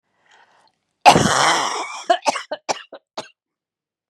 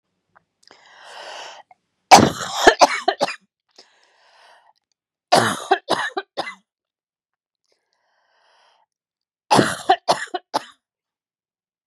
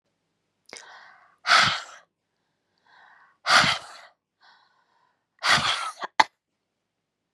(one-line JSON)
{"cough_length": "4.1 s", "cough_amplitude": 32768, "cough_signal_mean_std_ratio": 0.37, "three_cough_length": "11.9 s", "three_cough_amplitude": 32768, "three_cough_signal_mean_std_ratio": 0.27, "exhalation_length": "7.3 s", "exhalation_amplitude": 32717, "exhalation_signal_mean_std_ratio": 0.3, "survey_phase": "beta (2021-08-13 to 2022-03-07)", "age": "18-44", "gender": "Female", "wearing_mask": "No", "symptom_cough_any": true, "symptom_runny_or_blocked_nose": true, "symptom_sore_throat": true, "symptom_headache": true, "symptom_onset": "4 days", "smoker_status": "Never smoked", "respiratory_condition_asthma": false, "respiratory_condition_other": false, "recruitment_source": "Test and Trace", "submission_delay": "2 days", "covid_test_result": "Negative", "covid_test_method": "RT-qPCR"}